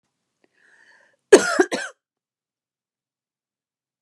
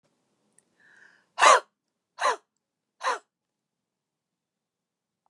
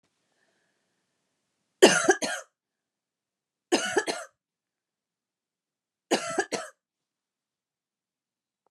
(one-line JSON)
{"cough_length": "4.0 s", "cough_amplitude": 32768, "cough_signal_mean_std_ratio": 0.19, "exhalation_length": "5.3 s", "exhalation_amplitude": 20860, "exhalation_signal_mean_std_ratio": 0.21, "three_cough_length": "8.7 s", "three_cough_amplitude": 25318, "three_cough_signal_mean_std_ratio": 0.24, "survey_phase": "beta (2021-08-13 to 2022-03-07)", "age": "45-64", "gender": "Female", "wearing_mask": "No", "symptom_none": true, "symptom_onset": "11 days", "smoker_status": "Never smoked", "respiratory_condition_asthma": true, "respiratory_condition_other": false, "recruitment_source": "REACT", "submission_delay": "1 day", "covid_test_result": "Negative", "covid_test_method": "RT-qPCR", "influenza_a_test_result": "Negative", "influenza_b_test_result": "Negative"}